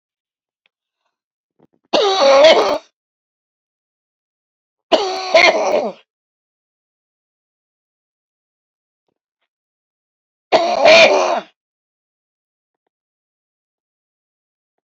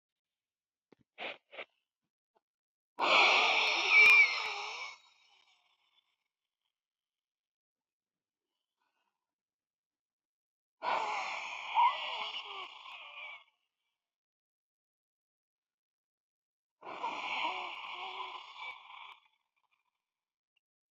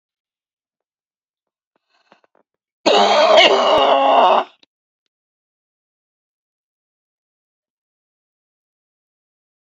{"three_cough_length": "14.8 s", "three_cough_amplitude": 29725, "three_cough_signal_mean_std_ratio": 0.32, "exhalation_length": "20.9 s", "exhalation_amplitude": 6731, "exhalation_signal_mean_std_ratio": 0.32, "cough_length": "9.7 s", "cough_amplitude": 29970, "cough_signal_mean_std_ratio": 0.33, "survey_phase": "beta (2021-08-13 to 2022-03-07)", "age": "65+", "gender": "Female", "wearing_mask": "No", "symptom_shortness_of_breath": true, "symptom_headache": true, "smoker_status": "Ex-smoker", "respiratory_condition_asthma": false, "respiratory_condition_other": true, "recruitment_source": "REACT", "submission_delay": "8 days", "covid_test_result": "Negative", "covid_test_method": "RT-qPCR", "influenza_a_test_result": "Negative", "influenza_b_test_result": "Negative"}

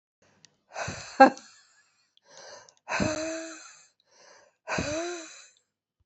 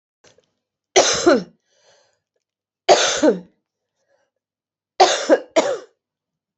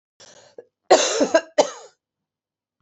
{"exhalation_length": "6.1 s", "exhalation_amplitude": 28328, "exhalation_signal_mean_std_ratio": 0.28, "three_cough_length": "6.6 s", "three_cough_amplitude": 31359, "three_cough_signal_mean_std_ratio": 0.35, "cough_length": "2.8 s", "cough_amplitude": 27683, "cough_signal_mean_std_ratio": 0.33, "survey_phase": "beta (2021-08-13 to 2022-03-07)", "age": "45-64", "gender": "Female", "wearing_mask": "No", "symptom_cough_any": true, "symptom_runny_or_blocked_nose": true, "symptom_fatigue": true, "symptom_headache": true, "symptom_loss_of_taste": true, "smoker_status": "Never smoked", "respiratory_condition_asthma": false, "respiratory_condition_other": false, "recruitment_source": "Test and Trace", "submission_delay": "1 day", "covid_test_result": "Positive", "covid_test_method": "RT-qPCR"}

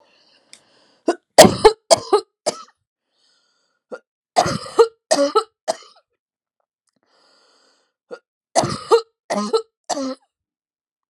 {"three_cough_length": "11.1 s", "three_cough_amplitude": 32768, "three_cough_signal_mean_std_ratio": 0.28, "survey_phase": "alpha (2021-03-01 to 2021-08-12)", "age": "45-64", "gender": "Female", "wearing_mask": "No", "symptom_shortness_of_breath": true, "symptom_fatigue": true, "symptom_headache": true, "symptom_onset": "11 days", "smoker_status": "Never smoked", "respiratory_condition_asthma": false, "respiratory_condition_other": true, "recruitment_source": "REACT", "submission_delay": "2 days", "covid_test_result": "Negative", "covid_test_method": "RT-qPCR"}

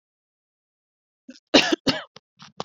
{"cough_length": "2.6 s", "cough_amplitude": 28974, "cough_signal_mean_std_ratio": 0.25, "survey_phase": "beta (2021-08-13 to 2022-03-07)", "age": "18-44", "gender": "Female", "wearing_mask": "No", "symptom_none": true, "smoker_status": "Never smoked", "respiratory_condition_asthma": false, "respiratory_condition_other": false, "recruitment_source": "REACT", "submission_delay": "1 day", "covid_test_result": "Negative", "covid_test_method": "RT-qPCR"}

